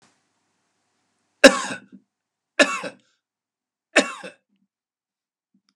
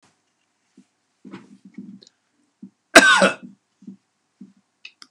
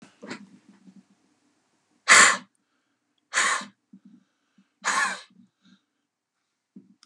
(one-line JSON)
{"three_cough_length": "5.8 s", "three_cough_amplitude": 32768, "three_cough_signal_mean_std_ratio": 0.19, "cough_length": "5.1 s", "cough_amplitude": 32768, "cough_signal_mean_std_ratio": 0.22, "exhalation_length": "7.1 s", "exhalation_amplitude": 26704, "exhalation_signal_mean_std_ratio": 0.25, "survey_phase": "beta (2021-08-13 to 2022-03-07)", "age": "65+", "gender": "Male", "wearing_mask": "No", "symptom_runny_or_blocked_nose": true, "symptom_fatigue": true, "symptom_onset": "12 days", "smoker_status": "Never smoked", "respiratory_condition_asthma": true, "respiratory_condition_other": false, "recruitment_source": "REACT", "submission_delay": "3 days", "covid_test_result": "Negative", "covid_test_method": "RT-qPCR"}